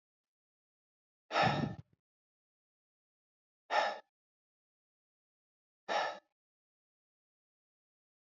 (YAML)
exhalation_length: 8.4 s
exhalation_amplitude: 4414
exhalation_signal_mean_std_ratio: 0.25
survey_phase: beta (2021-08-13 to 2022-03-07)
age: 18-44
gender: Male
wearing_mask: 'No'
symptom_none: true
smoker_status: Ex-smoker
respiratory_condition_asthma: false
respiratory_condition_other: false
recruitment_source: REACT
submission_delay: 6 days
covid_test_result: Negative
covid_test_method: RT-qPCR